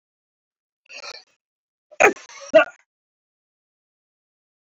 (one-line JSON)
{"cough_length": "4.8 s", "cough_amplitude": 29203, "cough_signal_mean_std_ratio": 0.18, "survey_phase": "beta (2021-08-13 to 2022-03-07)", "age": "65+", "gender": "Male", "wearing_mask": "No", "symptom_none": true, "smoker_status": "Never smoked", "respiratory_condition_asthma": false, "respiratory_condition_other": false, "recruitment_source": "REACT", "submission_delay": "2 days", "covid_test_result": "Negative", "covid_test_method": "RT-qPCR"}